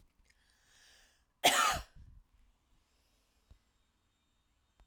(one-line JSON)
{"cough_length": "4.9 s", "cough_amplitude": 7358, "cough_signal_mean_std_ratio": 0.23, "survey_phase": "alpha (2021-03-01 to 2021-08-12)", "age": "45-64", "gender": "Female", "wearing_mask": "No", "symptom_none": true, "smoker_status": "Never smoked", "respiratory_condition_asthma": false, "respiratory_condition_other": false, "recruitment_source": "REACT", "submission_delay": "1 day", "covid_test_result": "Negative", "covid_test_method": "RT-qPCR"}